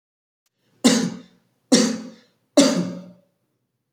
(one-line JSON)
{"three_cough_length": "3.9 s", "three_cough_amplitude": 28162, "three_cough_signal_mean_std_ratio": 0.37, "survey_phase": "beta (2021-08-13 to 2022-03-07)", "age": "18-44", "gender": "Male", "wearing_mask": "No", "symptom_cough_any": true, "symptom_runny_or_blocked_nose": true, "symptom_fever_high_temperature": true, "smoker_status": "Never smoked", "respiratory_condition_asthma": false, "respiratory_condition_other": false, "recruitment_source": "Test and Trace", "submission_delay": "2 days", "covid_test_result": "Positive", "covid_test_method": "RT-qPCR", "covid_ct_value": 27.8, "covid_ct_gene": "ORF1ab gene", "covid_ct_mean": 29.0, "covid_viral_load": "300 copies/ml", "covid_viral_load_category": "Minimal viral load (< 10K copies/ml)"}